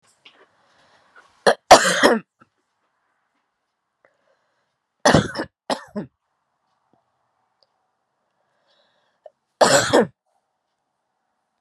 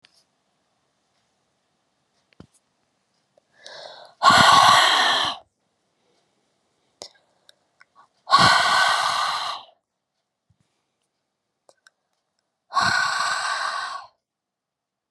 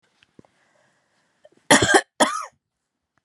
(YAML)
three_cough_length: 11.6 s
three_cough_amplitude: 32768
three_cough_signal_mean_std_ratio: 0.24
exhalation_length: 15.1 s
exhalation_amplitude: 29828
exhalation_signal_mean_std_ratio: 0.37
cough_length: 3.2 s
cough_amplitude: 32767
cough_signal_mean_std_ratio: 0.28
survey_phase: beta (2021-08-13 to 2022-03-07)
age: 18-44
gender: Female
wearing_mask: 'No'
symptom_cough_any: true
symptom_runny_or_blocked_nose: true
symptom_fatigue: true
symptom_fever_high_temperature: true
symptom_headache: true
symptom_change_to_sense_of_smell_or_taste: true
symptom_loss_of_taste: true
symptom_onset: 3 days
smoker_status: Never smoked
respiratory_condition_asthma: false
respiratory_condition_other: false
recruitment_source: Test and Trace
submission_delay: 2 days
covid_test_method: RT-qPCR
covid_ct_value: 25.4
covid_ct_gene: ORF1ab gene